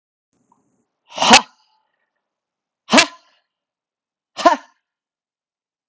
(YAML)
exhalation_length: 5.9 s
exhalation_amplitude: 32768
exhalation_signal_mean_std_ratio: 0.22
survey_phase: alpha (2021-03-01 to 2021-08-12)
age: 45-64
gender: Male
wearing_mask: 'No'
symptom_shortness_of_breath: true
symptom_fatigue: true
symptom_fever_high_temperature: true
symptom_headache: true
symptom_change_to_sense_of_smell_or_taste: true
symptom_onset: 3 days
smoker_status: Never smoked
respiratory_condition_asthma: true
respiratory_condition_other: false
recruitment_source: Test and Trace
submission_delay: 2 days
covid_test_result: Positive
covid_test_method: RT-qPCR
covid_ct_value: 12.9
covid_ct_gene: ORF1ab gene
covid_ct_mean: 13.6
covid_viral_load: 36000000 copies/ml
covid_viral_load_category: High viral load (>1M copies/ml)